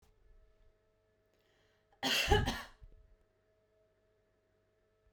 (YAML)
cough_length: 5.1 s
cough_amplitude: 6719
cough_signal_mean_std_ratio: 0.27
survey_phase: beta (2021-08-13 to 2022-03-07)
age: 18-44
gender: Female
wearing_mask: 'No'
symptom_none: true
smoker_status: Never smoked
respiratory_condition_asthma: false
respiratory_condition_other: false
recruitment_source: REACT
submission_delay: 1 day
covid_test_result: Negative
covid_test_method: RT-qPCR